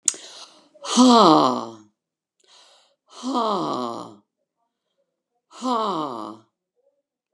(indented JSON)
{
  "exhalation_length": "7.3 s",
  "exhalation_amplitude": 32224,
  "exhalation_signal_mean_std_ratio": 0.37,
  "survey_phase": "beta (2021-08-13 to 2022-03-07)",
  "age": "65+",
  "gender": "Female",
  "wearing_mask": "Yes",
  "symptom_headache": true,
  "smoker_status": "Ex-smoker",
  "respiratory_condition_asthma": false,
  "respiratory_condition_other": false,
  "recruitment_source": "REACT",
  "submission_delay": "19 days",
  "covid_test_result": "Negative",
  "covid_test_method": "RT-qPCR",
  "influenza_a_test_result": "Negative",
  "influenza_b_test_result": "Negative"
}